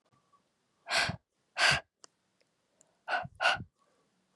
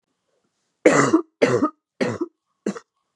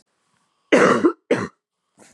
{"exhalation_length": "4.4 s", "exhalation_amplitude": 8369, "exhalation_signal_mean_std_ratio": 0.34, "three_cough_length": "3.2 s", "three_cough_amplitude": 29497, "three_cough_signal_mean_std_ratio": 0.4, "cough_length": "2.1 s", "cough_amplitude": 26482, "cough_signal_mean_std_ratio": 0.4, "survey_phase": "beta (2021-08-13 to 2022-03-07)", "age": "18-44", "gender": "Female", "wearing_mask": "No", "symptom_cough_any": true, "symptom_new_continuous_cough": true, "symptom_runny_or_blocked_nose": true, "symptom_shortness_of_breath": true, "symptom_sore_throat": true, "symptom_abdominal_pain": true, "symptom_fatigue": true, "symptom_fever_high_temperature": true, "symptom_headache": true, "symptom_onset": "4 days", "smoker_status": "Current smoker (e-cigarettes or vapes only)", "respiratory_condition_asthma": false, "respiratory_condition_other": false, "recruitment_source": "Test and Trace", "submission_delay": "1 day", "covid_test_result": "Positive", "covid_test_method": "ePCR"}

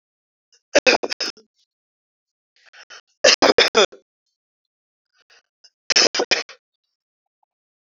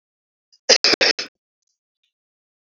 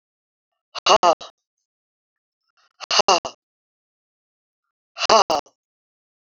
{"three_cough_length": "7.8 s", "three_cough_amplitude": 31612, "three_cough_signal_mean_std_ratio": 0.27, "cough_length": "2.7 s", "cough_amplitude": 32768, "cough_signal_mean_std_ratio": 0.26, "exhalation_length": "6.2 s", "exhalation_amplitude": 30920, "exhalation_signal_mean_std_ratio": 0.25, "survey_phase": "beta (2021-08-13 to 2022-03-07)", "age": "45-64", "gender": "Male", "wearing_mask": "No", "symptom_none": true, "smoker_status": "Never smoked", "respiratory_condition_asthma": false, "respiratory_condition_other": false, "recruitment_source": "REACT", "submission_delay": "4 days", "covid_test_result": "Negative", "covid_test_method": "RT-qPCR", "influenza_a_test_result": "Negative", "influenza_b_test_result": "Negative"}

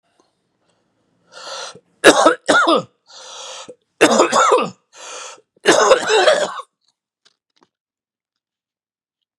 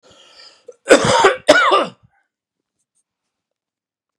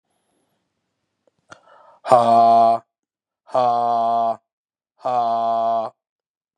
{"three_cough_length": "9.4 s", "three_cough_amplitude": 32768, "three_cough_signal_mean_std_ratio": 0.4, "cough_length": "4.2 s", "cough_amplitude": 32768, "cough_signal_mean_std_ratio": 0.35, "exhalation_length": "6.6 s", "exhalation_amplitude": 32660, "exhalation_signal_mean_std_ratio": 0.51, "survey_phase": "beta (2021-08-13 to 2022-03-07)", "age": "45-64", "gender": "Male", "wearing_mask": "No", "symptom_cough_any": true, "symptom_runny_or_blocked_nose": true, "symptom_other": true, "smoker_status": "Current smoker (1 to 10 cigarettes per day)", "respiratory_condition_asthma": false, "respiratory_condition_other": false, "recruitment_source": "Test and Trace", "submission_delay": "2 days", "covid_test_result": "Positive", "covid_test_method": "RT-qPCR", "covid_ct_value": 19.4, "covid_ct_gene": "N gene"}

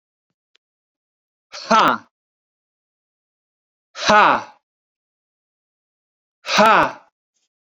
{"exhalation_length": "7.8 s", "exhalation_amplitude": 29115, "exhalation_signal_mean_std_ratio": 0.29, "survey_phase": "beta (2021-08-13 to 2022-03-07)", "age": "45-64", "gender": "Male", "wearing_mask": "No", "symptom_none": true, "smoker_status": "Never smoked", "respiratory_condition_asthma": false, "respiratory_condition_other": false, "recruitment_source": "REACT", "submission_delay": "2 days", "covid_test_result": "Negative", "covid_test_method": "RT-qPCR"}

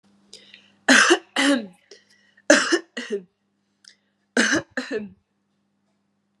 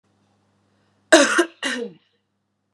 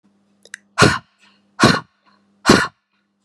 {"three_cough_length": "6.4 s", "three_cough_amplitude": 32766, "three_cough_signal_mean_std_ratio": 0.36, "cough_length": "2.7 s", "cough_amplitude": 32767, "cough_signal_mean_std_ratio": 0.3, "exhalation_length": "3.2 s", "exhalation_amplitude": 32768, "exhalation_signal_mean_std_ratio": 0.32, "survey_phase": "beta (2021-08-13 to 2022-03-07)", "age": "18-44", "gender": "Female", "wearing_mask": "No", "symptom_sore_throat": true, "smoker_status": "Never smoked", "respiratory_condition_asthma": false, "respiratory_condition_other": false, "recruitment_source": "Test and Trace", "submission_delay": "2 days", "covid_test_result": "Positive", "covid_test_method": "ePCR"}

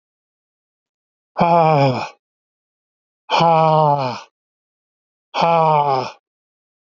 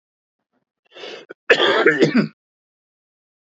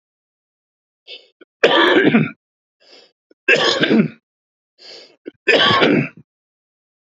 {"exhalation_length": "7.0 s", "exhalation_amplitude": 28428, "exhalation_signal_mean_std_ratio": 0.45, "cough_length": "3.4 s", "cough_amplitude": 28008, "cough_signal_mean_std_ratio": 0.38, "three_cough_length": "7.2 s", "three_cough_amplitude": 29500, "three_cough_signal_mean_std_ratio": 0.43, "survey_phase": "beta (2021-08-13 to 2022-03-07)", "age": "45-64", "gender": "Male", "wearing_mask": "No", "symptom_cough_any": true, "symptom_fatigue": true, "symptom_onset": "12 days", "smoker_status": "Never smoked", "respiratory_condition_asthma": false, "respiratory_condition_other": false, "recruitment_source": "REACT", "submission_delay": "1 day", "covid_test_result": "Negative", "covid_test_method": "RT-qPCR", "influenza_a_test_result": "Negative", "influenza_b_test_result": "Negative"}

